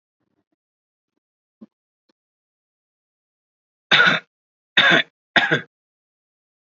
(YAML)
three_cough_length: 6.7 s
three_cough_amplitude: 31880
three_cough_signal_mean_std_ratio: 0.26
survey_phase: beta (2021-08-13 to 2022-03-07)
age: 18-44
gender: Male
wearing_mask: 'No'
symptom_none: true
smoker_status: Never smoked
respiratory_condition_asthma: false
respiratory_condition_other: false
recruitment_source: REACT
submission_delay: 1 day
covid_test_result: Negative
covid_test_method: RT-qPCR
influenza_a_test_result: Negative
influenza_b_test_result: Negative